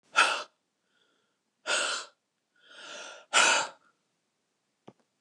{"exhalation_length": "5.2 s", "exhalation_amplitude": 12660, "exhalation_signal_mean_std_ratio": 0.34, "survey_phase": "beta (2021-08-13 to 2022-03-07)", "age": "65+", "gender": "Female", "wearing_mask": "No", "symptom_none": true, "smoker_status": "Ex-smoker", "respiratory_condition_asthma": false, "respiratory_condition_other": false, "recruitment_source": "REACT", "submission_delay": "3 days", "covid_test_result": "Negative", "covid_test_method": "RT-qPCR"}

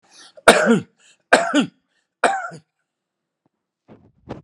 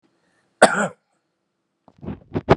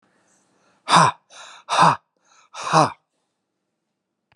{"three_cough_length": "4.4 s", "three_cough_amplitude": 32768, "three_cough_signal_mean_std_ratio": 0.32, "cough_length": "2.6 s", "cough_amplitude": 32768, "cough_signal_mean_std_ratio": 0.26, "exhalation_length": "4.4 s", "exhalation_amplitude": 30699, "exhalation_signal_mean_std_ratio": 0.32, "survey_phase": "beta (2021-08-13 to 2022-03-07)", "age": "45-64", "gender": "Male", "wearing_mask": "No", "symptom_none": true, "smoker_status": "Never smoked", "respiratory_condition_asthma": false, "respiratory_condition_other": false, "recruitment_source": "REACT", "submission_delay": "1 day", "covid_test_result": "Negative", "covid_test_method": "RT-qPCR"}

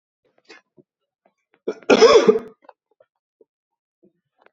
{"cough_length": "4.5 s", "cough_amplitude": 28651, "cough_signal_mean_std_ratio": 0.26, "survey_phase": "alpha (2021-03-01 to 2021-08-12)", "age": "18-44", "gender": "Male", "wearing_mask": "No", "symptom_cough_any": true, "symptom_diarrhoea": true, "symptom_fatigue": true, "symptom_fever_high_temperature": true, "symptom_headache": true, "symptom_change_to_sense_of_smell_or_taste": true, "symptom_loss_of_taste": true, "symptom_onset": "4 days", "smoker_status": "Never smoked", "respiratory_condition_asthma": false, "respiratory_condition_other": false, "recruitment_source": "Test and Trace", "submission_delay": "2 days", "covid_test_result": "Positive", "covid_test_method": "RT-qPCR", "covid_ct_value": 20.0, "covid_ct_gene": "N gene"}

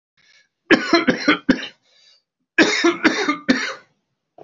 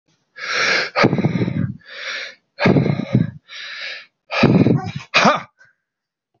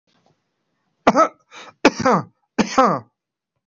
{"cough_length": "4.4 s", "cough_amplitude": 29672, "cough_signal_mean_std_ratio": 0.45, "exhalation_length": "6.4 s", "exhalation_amplitude": 28602, "exhalation_signal_mean_std_ratio": 0.56, "three_cough_length": "3.7 s", "three_cough_amplitude": 25517, "three_cough_signal_mean_std_ratio": 0.34, "survey_phase": "alpha (2021-03-01 to 2021-08-12)", "age": "45-64", "gender": "Male", "wearing_mask": "No", "symptom_none": true, "smoker_status": "Ex-smoker", "respiratory_condition_asthma": false, "respiratory_condition_other": false, "recruitment_source": "REACT", "submission_delay": "2 days", "covid_test_result": "Negative", "covid_test_method": "RT-qPCR"}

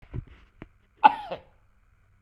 {"cough_length": "2.2 s", "cough_amplitude": 28221, "cough_signal_mean_std_ratio": 0.2, "survey_phase": "beta (2021-08-13 to 2022-03-07)", "age": "45-64", "gender": "Male", "wearing_mask": "No", "symptom_none": true, "smoker_status": "Ex-smoker", "respiratory_condition_asthma": true, "respiratory_condition_other": false, "recruitment_source": "REACT", "submission_delay": "1 day", "covid_test_result": "Negative", "covid_test_method": "RT-qPCR", "influenza_a_test_result": "Negative", "influenza_b_test_result": "Negative"}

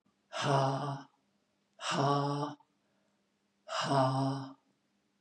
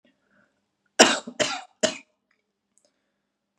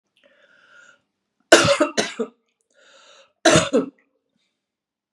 {"exhalation_length": "5.2 s", "exhalation_amplitude": 5513, "exhalation_signal_mean_std_ratio": 0.53, "cough_length": "3.6 s", "cough_amplitude": 32767, "cough_signal_mean_std_ratio": 0.23, "three_cough_length": "5.1 s", "three_cough_amplitude": 32768, "three_cough_signal_mean_std_ratio": 0.3, "survey_phase": "beta (2021-08-13 to 2022-03-07)", "age": "45-64", "gender": "Female", "wearing_mask": "No", "symptom_cough_any": true, "symptom_shortness_of_breath": true, "symptom_abdominal_pain": true, "symptom_fatigue": true, "symptom_onset": "12 days", "smoker_status": "Never smoked", "respiratory_condition_asthma": true, "respiratory_condition_other": false, "recruitment_source": "REACT", "submission_delay": "2 days", "covid_test_result": "Negative", "covid_test_method": "RT-qPCR", "influenza_a_test_result": "Unknown/Void", "influenza_b_test_result": "Unknown/Void"}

